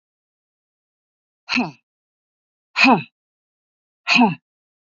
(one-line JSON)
{"exhalation_length": "4.9 s", "exhalation_amplitude": 27379, "exhalation_signal_mean_std_ratio": 0.28, "survey_phase": "beta (2021-08-13 to 2022-03-07)", "age": "45-64", "gender": "Female", "wearing_mask": "No", "symptom_cough_any": true, "smoker_status": "Never smoked", "respiratory_condition_asthma": false, "respiratory_condition_other": false, "recruitment_source": "REACT", "submission_delay": "1 day", "covid_test_result": "Negative", "covid_test_method": "RT-qPCR", "influenza_a_test_result": "Negative", "influenza_b_test_result": "Negative"}